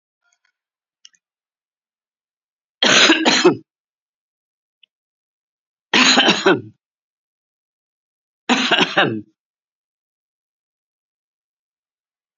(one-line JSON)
{"three_cough_length": "12.4 s", "three_cough_amplitude": 32470, "three_cough_signal_mean_std_ratio": 0.31, "survey_phase": "beta (2021-08-13 to 2022-03-07)", "age": "45-64", "gender": "Female", "wearing_mask": "No", "symptom_none": true, "smoker_status": "Ex-smoker", "respiratory_condition_asthma": false, "respiratory_condition_other": false, "recruitment_source": "REACT", "submission_delay": "5 days", "covid_test_result": "Negative", "covid_test_method": "RT-qPCR", "influenza_a_test_result": "Negative", "influenza_b_test_result": "Negative"}